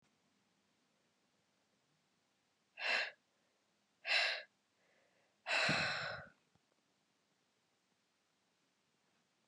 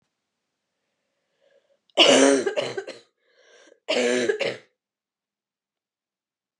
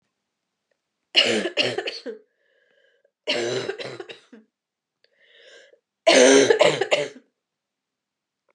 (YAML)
exhalation_length: 9.5 s
exhalation_amplitude: 2522
exhalation_signal_mean_std_ratio: 0.31
cough_length: 6.6 s
cough_amplitude: 25812
cough_signal_mean_std_ratio: 0.34
three_cough_length: 8.5 s
three_cough_amplitude: 25481
three_cough_signal_mean_std_ratio: 0.36
survey_phase: beta (2021-08-13 to 2022-03-07)
age: 18-44
gender: Female
wearing_mask: 'No'
symptom_cough_any: true
symptom_new_continuous_cough: true
symptom_runny_or_blocked_nose: true
symptom_shortness_of_breath: true
symptom_sore_throat: true
symptom_abdominal_pain: true
symptom_fatigue: true
symptom_fever_high_temperature: true
symptom_loss_of_taste: true
symptom_other: true
smoker_status: Never smoked
respiratory_condition_asthma: false
respiratory_condition_other: false
recruitment_source: Test and Trace
submission_delay: 0 days
covid_test_result: Positive
covid_test_method: LFT